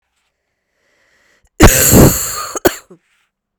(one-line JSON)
{"cough_length": "3.6 s", "cough_amplitude": 32768, "cough_signal_mean_std_ratio": 0.38, "survey_phase": "beta (2021-08-13 to 2022-03-07)", "age": "18-44", "gender": "Female", "wearing_mask": "No", "symptom_cough_any": true, "symptom_runny_or_blocked_nose": true, "symptom_diarrhoea": true, "symptom_headache": true, "symptom_loss_of_taste": true, "smoker_status": "Never smoked", "respiratory_condition_asthma": true, "respiratory_condition_other": false, "recruitment_source": "Test and Trace", "submission_delay": "3 days", "covid_test_result": "Positive", "covid_test_method": "RT-qPCR", "covid_ct_value": 28.4, "covid_ct_gene": "ORF1ab gene", "covid_ct_mean": 29.2, "covid_viral_load": "270 copies/ml", "covid_viral_load_category": "Minimal viral load (< 10K copies/ml)"}